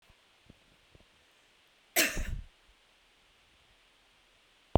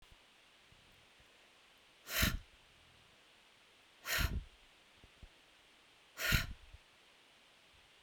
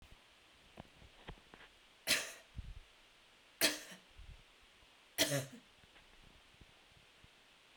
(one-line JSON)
{"cough_length": "4.8 s", "cough_amplitude": 16672, "cough_signal_mean_std_ratio": 0.24, "exhalation_length": "8.0 s", "exhalation_amplitude": 5152, "exhalation_signal_mean_std_ratio": 0.33, "three_cough_length": "7.8 s", "three_cough_amplitude": 4906, "three_cough_signal_mean_std_ratio": 0.32, "survey_phase": "beta (2021-08-13 to 2022-03-07)", "age": "45-64", "gender": "Female", "wearing_mask": "No", "symptom_none": true, "smoker_status": "Never smoked", "respiratory_condition_asthma": false, "respiratory_condition_other": false, "recruitment_source": "REACT", "submission_delay": "1 day", "covid_test_result": "Negative", "covid_test_method": "RT-qPCR"}